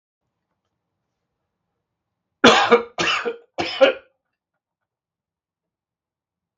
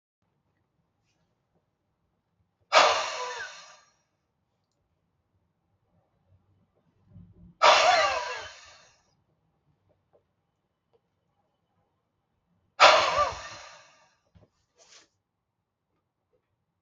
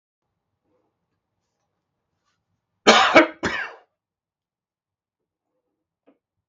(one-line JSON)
{"three_cough_length": "6.6 s", "three_cough_amplitude": 31685, "three_cough_signal_mean_std_ratio": 0.27, "exhalation_length": "16.8 s", "exhalation_amplitude": 29211, "exhalation_signal_mean_std_ratio": 0.24, "cough_length": "6.5 s", "cough_amplitude": 32111, "cough_signal_mean_std_ratio": 0.21, "survey_phase": "beta (2021-08-13 to 2022-03-07)", "age": "65+", "gender": "Male", "wearing_mask": "No", "symptom_none": true, "smoker_status": "Never smoked", "respiratory_condition_asthma": false, "respiratory_condition_other": false, "recruitment_source": "REACT", "submission_delay": "2 days", "covid_test_result": "Negative", "covid_test_method": "RT-qPCR", "influenza_a_test_result": "Negative", "influenza_b_test_result": "Negative"}